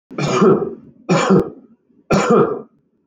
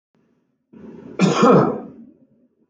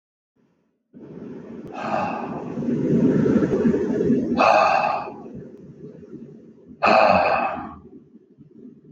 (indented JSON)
{
  "three_cough_length": "3.1 s",
  "three_cough_amplitude": 26108,
  "three_cough_signal_mean_std_ratio": 0.58,
  "cough_length": "2.7 s",
  "cough_amplitude": 24923,
  "cough_signal_mean_std_ratio": 0.4,
  "exhalation_length": "8.9 s",
  "exhalation_amplitude": 22690,
  "exhalation_signal_mean_std_ratio": 0.62,
  "survey_phase": "beta (2021-08-13 to 2022-03-07)",
  "age": "18-44",
  "gender": "Male",
  "wearing_mask": "No",
  "symptom_runny_or_blocked_nose": true,
  "symptom_onset": "12 days",
  "smoker_status": "Ex-smoker",
  "respiratory_condition_asthma": false,
  "respiratory_condition_other": false,
  "recruitment_source": "REACT",
  "submission_delay": "2 days",
  "covid_test_result": "Negative",
  "covid_test_method": "RT-qPCR"
}